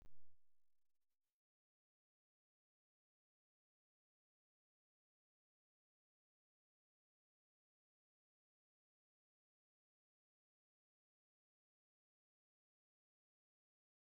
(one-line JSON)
{"three_cough_length": "14.2 s", "three_cough_amplitude": 181, "three_cough_signal_mean_std_ratio": 0.17, "survey_phase": "beta (2021-08-13 to 2022-03-07)", "age": "65+", "gender": "Female", "wearing_mask": "No", "symptom_none": true, "smoker_status": "Ex-smoker", "respiratory_condition_asthma": false, "respiratory_condition_other": false, "recruitment_source": "REACT", "submission_delay": "1 day", "covid_test_result": "Negative", "covid_test_method": "RT-qPCR", "influenza_a_test_result": "Negative", "influenza_b_test_result": "Negative"}